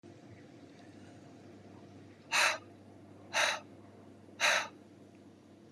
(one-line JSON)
{"exhalation_length": "5.7 s", "exhalation_amplitude": 6051, "exhalation_signal_mean_std_ratio": 0.4, "survey_phase": "beta (2021-08-13 to 2022-03-07)", "age": "45-64", "gender": "Female", "wearing_mask": "No", "symptom_none": true, "smoker_status": "Ex-smoker", "respiratory_condition_asthma": true, "respiratory_condition_other": true, "recruitment_source": "REACT", "submission_delay": "1 day", "covid_test_result": "Negative", "covid_test_method": "RT-qPCR", "influenza_a_test_result": "Negative", "influenza_b_test_result": "Negative"}